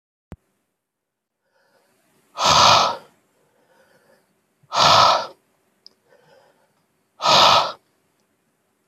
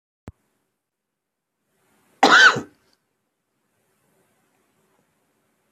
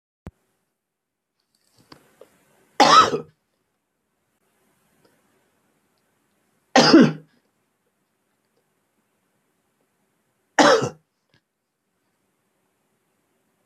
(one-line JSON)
{"exhalation_length": "8.9 s", "exhalation_amplitude": 28148, "exhalation_signal_mean_std_ratio": 0.34, "cough_length": "5.7 s", "cough_amplitude": 26310, "cough_signal_mean_std_ratio": 0.2, "three_cough_length": "13.7 s", "three_cough_amplitude": 28690, "three_cough_signal_mean_std_ratio": 0.21, "survey_phase": "beta (2021-08-13 to 2022-03-07)", "age": "45-64", "gender": "Male", "wearing_mask": "No", "symptom_cough_any": true, "symptom_runny_or_blocked_nose": true, "symptom_headache": true, "symptom_onset": "5 days", "smoker_status": "Never smoked", "respiratory_condition_asthma": false, "respiratory_condition_other": false, "recruitment_source": "Test and Trace", "submission_delay": "2 days", "covid_test_result": "Positive", "covid_test_method": "RT-qPCR", "covid_ct_value": 33.8, "covid_ct_gene": "ORF1ab gene", "covid_ct_mean": 34.8, "covid_viral_load": "3.9 copies/ml", "covid_viral_load_category": "Minimal viral load (< 10K copies/ml)"}